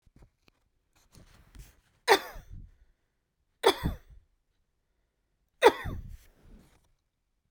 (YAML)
three_cough_length: 7.5 s
three_cough_amplitude: 18462
three_cough_signal_mean_std_ratio: 0.21
survey_phase: beta (2021-08-13 to 2022-03-07)
age: 45-64
gender: Female
wearing_mask: 'No'
symptom_new_continuous_cough: true
symptom_runny_or_blocked_nose: true
symptom_fatigue: true
symptom_headache: true
smoker_status: Never smoked
respiratory_condition_asthma: true
respiratory_condition_other: false
recruitment_source: Test and Trace
submission_delay: 2 days
covid_test_result: Positive
covid_test_method: RT-qPCR
covid_ct_value: 16.2
covid_ct_gene: ORF1ab gene
covid_ct_mean: 16.4
covid_viral_load: 4100000 copies/ml
covid_viral_load_category: High viral load (>1M copies/ml)